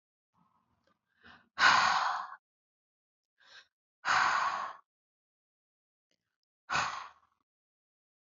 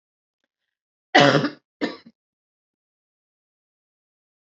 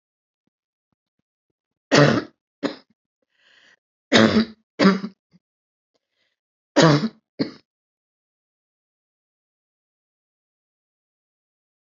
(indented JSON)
{
  "exhalation_length": "8.3 s",
  "exhalation_amplitude": 9290,
  "exhalation_signal_mean_std_ratio": 0.33,
  "cough_length": "4.4 s",
  "cough_amplitude": 30797,
  "cough_signal_mean_std_ratio": 0.22,
  "three_cough_length": "11.9 s",
  "three_cough_amplitude": 30237,
  "three_cough_signal_mean_std_ratio": 0.24,
  "survey_phase": "alpha (2021-03-01 to 2021-08-12)",
  "age": "45-64",
  "gender": "Female",
  "wearing_mask": "No",
  "symptom_none": true,
  "smoker_status": "Never smoked",
  "respiratory_condition_asthma": false,
  "respiratory_condition_other": false,
  "recruitment_source": "REACT",
  "submission_delay": "1 day",
  "covid_test_result": "Negative",
  "covid_test_method": "RT-qPCR"
}